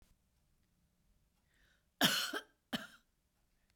cough_length: 3.8 s
cough_amplitude: 5678
cough_signal_mean_std_ratio: 0.26
survey_phase: beta (2021-08-13 to 2022-03-07)
age: 45-64
gender: Female
wearing_mask: 'No'
symptom_none: true
smoker_status: Ex-smoker
respiratory_condition_asthma: false
respiratory_condition_other: false
recruitment_source: REACT
submission_delay: 1 day
covid_test_result: Negative
covid_test_method: RT-qPCR
influenza_a_test_result: Negative
influenza_b_test_result: Negative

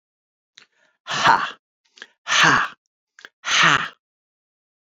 exhalation_length: 4.9 s
exhalation_amplitude: 28363
exhalation_signal_mean_std_ratio: 0.38
survey_phase: alpha (2021-03-01 to 2021-08-12)
age: 45-64
gender: Male
wearing_mask: 'No'
symptom_fatigue: true
symptom_onset: 2 days
smoker_status: Ex-smoker
respiratory_condition_asthma: false
respiratory_condition_other: false
recruitment_source: Test and Trace
submission_delay: 2 days
covid_test_result: Positive
covid_test_method: RT-qPCR
covid_ct_value: 27.8
covid_ct_gene: N gene
covid_ct_mean: 28.3
covid_viral_load: 530 copies/ml
covid_viral_load_category: Minimal viral load (< 10K copies/ml)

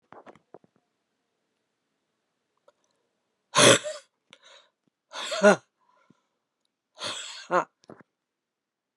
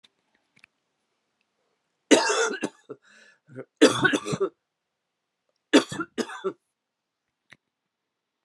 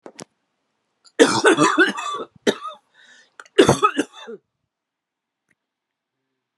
exhalation_length: 9.0 s
exhalation_amplitude: 24776
exhalation_signal_mean_std_ratio: 0.21
three_cough_length: 8.4 s
three_cough_amplitude: 22562
three_cough_signal_mean_std_ratio: 0.28
cough_length: 6.6 s
cough_amplitude: 32767
cough_signal_mean_std_ratio: 0.34
survey_phase: alpha (2021-03-01 to 2021-08-12)
age: 45-64
gender: Female
wearing_mask: 'No'
symptom_new_continuous_cough: true
symptom_fatigue: true
symptom_headache: true
symptom_change_to_sense_of_smell_or_taste: true
symptom_loss_of_taste: true
symptom_onset: 5 days
smoker_status: Never smoked
respiratory_condition_asthma: true
respiratory_condition_other: false
recruitment_source: Test and Trace
submission_delay: 1 day
covid_test_result: Positive
covid_test_method: RT-qPCR
covid_ct_value: 26.2
covid_ct_gene: N gene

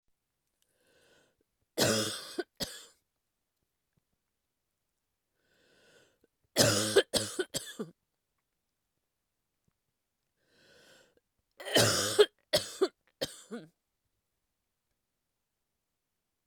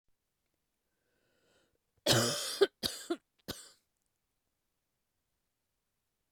three_cough_length: 16.5 s
three_cough_amplitude: 12645
three_cough_signal_mean_std_ratio: 0.26
cough_length: 6.3 s
cough_amplitude: 7407
cough_signal_mean_std_ratio: 0.25
survey_phase: beta (2021-08-13 to 2022-03-07)
age: 45-64
gender: Female
wearing_mask: 'No'
symptom_cough_any: true
symptom_new_continuous_cough: true
symptom_runny_or_blocked_nose: true
symptom_shortness_of_breath: true
symptom_sore_throat: true
symptom_abdominal_pain: true
symptom_fatigue: true
symptom_fever_high_temperature: true
symptom_headache: true
symptom_change_to_sense_of_smell_or_taste: true
symptom_loss_of_taste: true
symptom_other: true
symptom_onset: 5 days
smoker_status: Never smoked
respiratory_condition_asthma: false
respiratory_condition_other: false
recruitment_source: Test and Trace
submission_delay: 4 days
covid_test_result: Positive
covid_test_method: RT-qPCR
covid_ct_value: 14.9
covid_ct_gene: ORF1ab gene
covid_ct_mean: 15.5
covid_viral_load: 8400000 copies/ml
covid_viral_load_category: High viral load (>1M copies/ml)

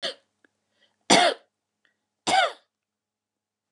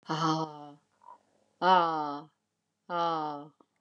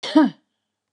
three_cough_length: 3.7 s
three_cough_amplitude: 22967
three_cough_signal_mean_std_ratio: 0.29
exhalation_length: 3.8 s
exhalation_amplitude: 9256
exhalation_signal_mean_std_ratio: 0.46
cough_length: 0.9 s
cough_amplitude: 21217
cough_signal_mean_std_ratio: 0.37
survey_phase: beta (2021-08-13 to 2022-03-07)
age: 65+
gender: Female
wearing_mask: 'No'
symptom_none: true
smoker_status: Never smoked
respiratory_condition_asthma: false
respiratory_condition_other: false
recruitment_source: REACT
submission_delay: 1 day
covid_test_result: Negative
covid_test_method: RT-qPCR
influenza_a_test_result: Negative
influenza_b_test_result: Negative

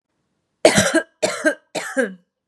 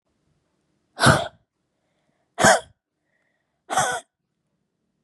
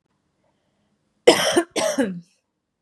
three_cough_length: 2.5 s
three_cough_amplitude: 32768
three_cough_signal_mean_std_ratio: 0.43
exhalation_length: 5.0 s
exhalation_amplitude: 29303
exhalation_signal_mean_std_ratio: 0.27
cough_length: 2.8 s
cough_amplitude: 32767
cough_signal_mean_std_ratio: 0.35
survey_phase: beta (2021-08-13 to 2022-03-07)
age: 18-44
gender: Female
wearing_mask: 'No'
symptom_none: true
smoker_status: Never smoked
respiratory_condition_asthma: false
respiratory_condition_other: false
recruitment_source: REACT
submission_delay: 1 day
covid_test_result: Negative
covid_test_method: RT-qPCR
influenza_a_test_result: Unknown/Void
influenza_b_test_result: Unknown/Void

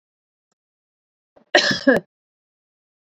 cough_length: 3.2 s
cough_amplitude: 30674
cough_signal_mean_std_ratio: 0.25
survey_phase: beta (2021-08-13 to 2022-03-07)
age: 45-64
gender: Female
wearing_mask: 'No'
symptom_cough_any: true
smoker_status: Ex-smoker
respiratory_condition_asthma: false
respiratory_condition_other: false
recruitment_source: REACT
submission_delay: 2 days
covid_test_result: Negative
covid_test_method: RT-qPCR
influenza_a_test_result: Negative
influenza_b_test_result: Negative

